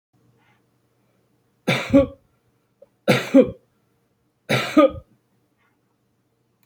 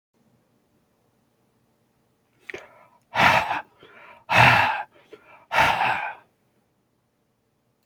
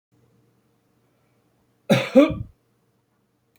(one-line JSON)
{"three_cough_length": "6.7 s", "three_cough_amplitude": 26049, "three_cough_signal_mean_std_ratio": 0.28, "exhalation_length": "7.9 s", "exhalation_amplitude": 24554, "exhalation_signal_mean_std_ratio": 0.34, "cough_length": "3.6 s", "cough_amplitude": 27076, "cough_signal_mean_std_ratio": 0.24, "survey_phase": "beta (2021-08-13 to 2022-03-07)", "age": "65+", "gender": "Male", "wearing_mask": "No", "symptom_none": true, "smoker_status": "Ex-smoker", "respiratory_condition_asthma": false, "respiratory_condition_other": false, "recruitment_source": "REACT", "submission_delay": "1 day", "covid_test_result": "Negative", "covid_test_method": "RT-qPCR"}